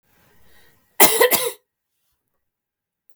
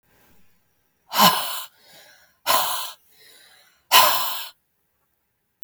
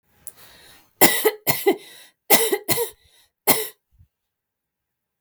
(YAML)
cough_length: 3.2 s
cough_amplitude: 32768
cough_signal_mean_std_ratio: 0.28
exhalation_length: 5.6 s
exhalation_amplitude: 32275
exhalation_signal_mean_std_ratio: 0.36
three_cough_length: 5.2 s
three_cough_amplitude: 32768
three_cough_signal_mean_std_ratio: 0.35
survey_phase: beta (2021-08-13 to 2022-03-07)
age: 45-64
gender: Female
wearing_mask: 'No'
symptom_none: true
smoker_status: Never smoked
respiratory_condition_asthma: true
respiratory_condition_other: false
recruitment_source: REACT
submission_delay: 2 days
covid_test_result: Negative
covid_test_method: RT-qPCR
influenza_a_test_result: Negative
influenza_b_test_result: Negative